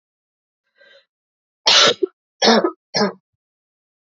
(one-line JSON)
{"three_cough_length": "4.2 s", "three_cough_amplitude": 31144, "three_cough_signal_mean_std_ratio": 0.33, "survey_phase": "beta (2021-08-13 to 2022-03-07)", "age": "18-44", "gender": "Female", "wearing_mask": "No", "symptom_cough_any": true, "symptom_runny_or_blocked_nose": true, "symptom_shortness_of_breath": true, "symptom_sore_throat": true, "symptom_fatigue": true, "symptom_headache": true, "smoker_status": "Never smoked", "respiratory_condition_asthma": true, "respiratory_condition_other": false, "recruitment_source": "Test and Trace", "submission_delay": "1 day", "covid_test_result": "Positive", "covid_test_method": "RT-qPCR", "covid_ct_value": 29.2, "covid_ct_gene": "N gene"}